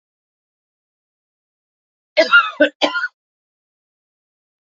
{"cough_length": "4.6 s", "cough_amplitude": 28459, "cough_signal_mean_std_ratio": 0.26, "survey_phase": "alpha (2021-03-01 to 2021-08-12)", "age": "45-64", "gender": "Female", "wearing_mask": "No", "symptom_none": true, "smoker_status": "Ex-smoker", "respiratory_condition_asthma": false, "respiratory_condition_other": false, "recruitment_source": "REACT", "submission_delay": "2 days", "covid_test_result": "Negative", "covid_test_method": "RT-qPCR"}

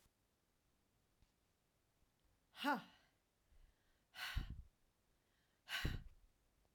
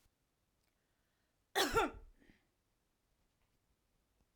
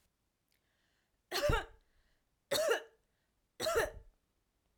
{"exhalation_length": "6.7 s", "exhalation_amplitude": 1515, "exhalation_signal_mean_std_ratio": 0.31, "cough_length": "4.4 s", "cough_amplitude": 3857, "cough_signal_mean_std_ratio": 0.23, "three_cough_length": "4.8 s", "three_cough_amplitude": 3606, "three_cough_signal_mean_std_ratio": 0.37, "survey_phase": "beta (2021-08-13 to 2022-03-07)", "age": "45-64", "gender": "Female", "wearing_mask": "No", "symptom_none": true, "symptom_onset": "13 days", "smoker_status": "Never smoked", "respiratory_condition_asthma": false, "respiratory_condition_other": false, "recruitment_source": "REACT", "submission_delay": "2 days", "covid_test_result": "Negative", "covid_test_method": "RT-qPCR"}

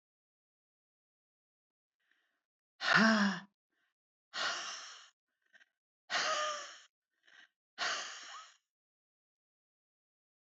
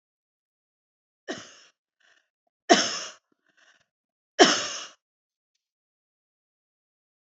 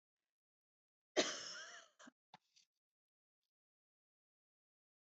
{"exhalation_length": "10.5 s", "exhalation_amplitude": 7090, "exhalation_signal_mean_std_ratio": 0.31, "three_cough_length": "7.3 s", "three_cough_amplitude": 27926, "three_cough_signal_mean_std_ratio": 0.2, "cough_length": "5.1 s", "cough_amplitude": 3110, "cough_signal_mean_std_ratio": 0.2, "survey_phase": "beta (2021-08-13 to 2022-03-07)", "age": "65+", "gender": "Female", "wearing_mask": "No", "symptom_none": true, "smoker_status": "Never smoked", "respiratory_condition_asthma": false, "respiratory_condition_other": false, "recruitment_source": "REACT", "submission_delay": "1 day", "covid_test_result": "Negative", "covid_test_method": "RT-qPCR"}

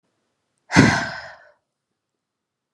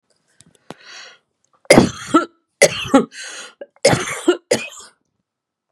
{"exhalation_length": "2.7 s", "exhalation_amplitude": 32695, "exhalation_signal_mean_std_ratio": 0.28, "three_cough_length": "5.7 s", "three_cough_amplitude": 32768, "three_cough_signal_mean_std_ratio": 0.34, "survey_phase": "beta (2021-08-13 to 2022-03-07)", "age": "45-64", "gender": "Female", "wearing_mask": "No", "symptom_runny_or_blocked_nose": true, "symptom_sore_throat": true, "symptom_fatigue": true, "symptom_headache": true, "symptom_onset": "3 days", "smoker_status": "Current smoker (1 to 10 cigarettes per day)", "respiratory_condition_asthma": false, "respiratory_condition_other": false, "recruitment_source": "Test and Trace", "submission_delay": "1 day", "covid_test_result": "Positive", "covid_test_method": "RT-qPCR"}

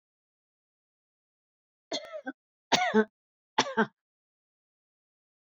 {"three_cough_length": "5.5 s", "three_cough_amplitude": 11587, "three_cough_signal_mean_std_ratio": 0.24, "survey_phase": "beta (2021-08-13 to 2022-03-07)", "age": "65+", "gender": "Female", "wearing_mask": "No", "symptom_cough_any": true, "symptom_runny_or_blocked_nose": true, "symptom_sore_throat": true, "symptom_fatigue": true, "symptom_headache": true, "symptom_loss_of_taste": true, "symptom_onset": "15 days", "smoker_status": "Never smoked", "respiratory_condition_asthma": false, "respiratory_condition_other": false, "recruitment_source": "Test and Trace", "submission_delay": "2 days", "covid_test_result": "Positive", "covid_test_method": "RT-qPCR", "covid_ct_value": 34.9, "covid_ct_gene": "ORF1ab gene"}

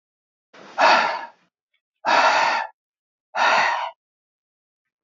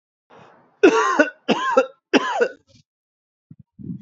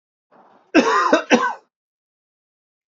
{"exhalation_length": "5.0 s", "exhalation_amplitude": 25184, "exhalation_signal_mean_std_ratio": 0.46, "three_cough_length": "4.0 s", "three_cough_amplitude": 27719, "three_cough_signal_mean_std_ratio": 0.41, "cough_length": "2.9 s", "cough_amplitude": 29991, "cough_signal_mean_std_ratio": 0.38, "survey_phase": "alpha (2021-03-01 to 2021-08-12)", "age": "65+", "gender": "Male", "wearing_mask": "No", "symptom_cough_any": true, "symptom_change_to_sense_of_smell_or_taste": true, "symptom_loss_of_taste": true, "symptom_onset": "3 days", "smoker_status": "Ex-smoker", "respiratory_condition_asthma": false, "respiratory_condition_other": false, "recruitment_source": "Test and Trace", "submission_delay": "1 day", "covid_test_result": "Positive", "covid_test_method": "RT-qPCR"}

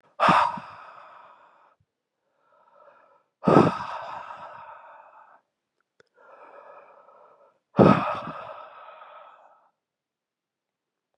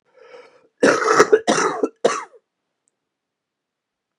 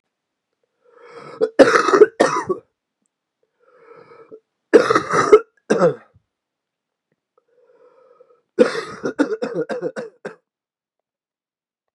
{"exhalation_length": "11.2 s", "exhalation_amplitude": 28291, "exhalation_signal_mean_std_ratio": 0.27, "cough_length": "4.2 s", "cough_amplitude": 32767, "cough_signal_mean_std_ratio": 0.37, "three_cough_length": "11.9 s", "three_cough_amplitude": 32768, "three_cough_signal_mean_std_ratio": 0.32, "survey_phase": "beta (2021-08-13 to 2022-03-07)", "age": "18-44", "gender": "Male", "wearing_mask": "No", "symptom_cough_any": true, "symptom_runny_or_blocked_nose": true, "symptom_shortness_of_breath": true, "symptom_fatigue": true, "symptom_fever_high_temperature": true, "symptom_headache": true, "symptom_onset": "3 days", "smoker_status": "Ex-smoker", "respiratory_condition_asthma": true, "respiratory_condition_other": false, "recruitment_source": "Test and Trace", "submission_delay": "1 day", "covid_test_result": "Positive", "covid_test_method": "RT-qPCR", "covid_ct_value": 15.4, "covid_ct_gene": "ORF1ab gene", "covid_ct_mean": 16.2, "covid_viral_load": "4800000 copies/ml", "covid_viral_load_category": "High viral load (>1M copies/ml)"}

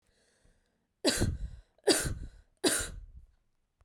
{"three_cough_length": "3.8 s", "three_cough_amplitude": 10095, "three_cough_signal_mean_std_ratio": 0.42, "survey_phase": "beta (2021-08-13 to 2022-03-07)", "age": "18-44", "gender": "Female", "wearing_mask": "No", "symptom_runny_or_blocked_nose": true, "smoker_status": "Never smoked", "respiratory_condition_asthma": false, "respiratory_condition_other": false, "recruitment_source": "Test and Trace", "submission_delay": "2 days", "covid_test_result": "Positive", "covid_test_method": "RT-qPCR", "covid_ct_value": 30.8, "covid_ct_gene": "ORF1ab gene", "covid_ct_mean": 31.7, "covid_viral_load": "39 copies/ml", "covid_viral_load_category": "Minimal viral load (< 10K copies/ml)"}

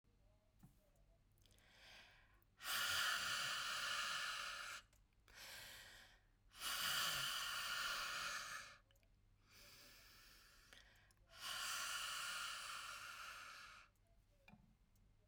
{"exhalation_length": "15.3 s", "exhalation_amplitude": 1143, "exhalation_signal_mean_std_ratio": 0.63, "survey_phase": "beta (2021-08-13 to 2022-03-07)", "age": "45-64", "gender": "Female", "wearing_mask": "No", "symptom_none": true, "smoker_status": "Ex-smoker", "respiratory_condition_asthma": false, "respiratory_condition_other": false, "recruitment_source": "REACT", "submission_delay": "2 days", "covid_test_result": "Negative", "covid_test_method": "RT-qPCR"}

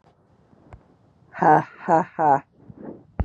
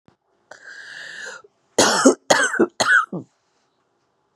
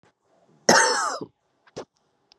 {"exhalation_length": "3.2 s", "exhalation_amplitude": 22434, "exhalation_signal_mean_std_ratio": 0.37, "three_cough_length": "4.4 s", "three_cough_amplitude": 32454, "three_cough_signal_mean_std_ratio": 0.4, "cough_length": "2.4 s", "cough_amplitude": 30663, "cough_signal_mean_std_ratio": 0.35, "survey_phase": "beta (2021-08-13 to 2022-03-07)", "age": "18-44", "gender": "Female", "wearing_mask": "No", "symptom_runny_or_blocked_nose": true, "symptom_shortness_of_breath": true, "symptom_sore_throat": true, "symptom_fatigue": true, "symptom_fever_high_temperature": true, "symptom_headache": true, "symptom_change_to_sense_of_smell_or_taste": true, "symptom_loss_of_taste": true, "symptom_other": true, "symptom_onset": "3 days", "smoker_status": "Ex-smoker", "respiratory_condition_asthma": false, "respiratory_condition_other": false, "recruitment_source": "Test and Trace", "submission_delay": "1 day", "covid_test_result": "Positive", "covid_test_method": "RT-qPCR", "covid_ct_value": 21.0, "covid_ct_gene": "ORF1ab gene"}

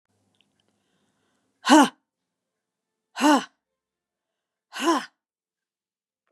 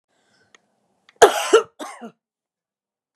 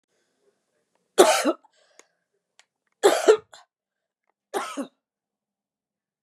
{"exhalation_length": "6.3 s", "exhalation_amplitude": 27721, "exhalation_signal_mean_std_ratio": 0.23, "cough_length": "3.2 s", "cough_amplitude": 32768, "cough_signal_mean_std_ratio": 0.23, "three_cough_length": "6.2 s", "three_cough_amplitude": 32573, "three_cough_signal_mean_std_ratio": 0.25, "survey_phase": "beta (2021-08-13 to 2022-03-07)", "age": "45-64", "gender": "Female", "wearing_mask": "No", "symptom_none": true, "symptom_onset": "12 days", "smoker_status": "Ex-smoker", "respiratory_condition_asthma": false, "respiratory_condition_other": false, "recruitment_source": "REACT", "submission_delay": "2 days", "covid_test_result": "Negative", "covid_test_method": "RT-qPCR", "covid_ct_value": 39.0, "covid_ct_gene": "N gene", "influenza_a_test_result": "Negative", "influenza_b_test_result": "Negative"}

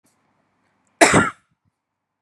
{"cough_length": "2.2 s", "cough_amplitude": 32767, "cough_signal_mean_std_ratio": 0.26, "survey_phase": "beta (2021-08-13 to 2022-03-07)", "age": "18-44", "gender": "Female", "wearing_mask": "No", "symptom_none": true, "smoker_status": "Never smoked", "respiratory_condition_asthma": false, "respiratory_condition_other": false, "recruitment_source": "Test and Trace", "submission_delay": "1 day", "covid_test_result": "Negative", "covid_test_method": "RT-qPCR"}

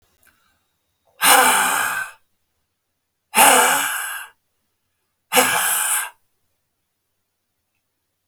{"exhalation_length": "8.3 s", "exhalation_amplitude": 32768, "exhalation_signal_mean_std_ratio": 0.41, "survey_phase": "beta (2021-08-13 to 2022-03-07)", "age": "45-64", "gender": "Male", "wearing_mask": "No", "symptom_none": true, "smoker_status": "Never smoked", "respiratory_condition_asthma": false, "respiratory_condition_other": false, "recruitment_source": "REACT", "submission_delay": "1 day", "covid_test_result": "Negative", "covid_test_method": "RT-qPCR"}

